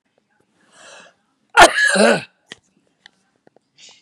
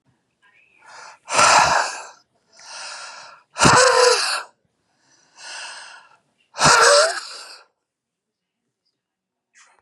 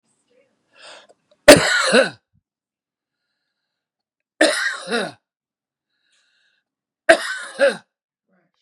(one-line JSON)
{"cough_length": "4.0 s", "cough_amplitude": 32768, "cough_signal_mean_std_ratio": 0.29, "exhalation_length": "9.8 s", "exhalation_amplitude": 32623, "exhalation_signal_mean_std_ratio": 0.39, "three_cough_length": "8.6 s", "three_cough_amplitude": 32768, "three_cough_signal_mean_std_ratio": 0.27, "survey_phase": "beta (2021-08-13 to 2022-03-07)", "age": "45-64", "gender": "Male", "wearing_mask": "No", "symptom_none": true, "smoker_status": "Never smoked", "respiratory_condition_asthma": false, "respiratory_condition_other": false, "recruitment_source": "REACT", "submission_delay": "2 days", "covid_test_result": "Negative", "covid_test_method": "RT-qPCR", "influenza_a_test_result": "Negative", "influenza_b_test_result": "Negative"}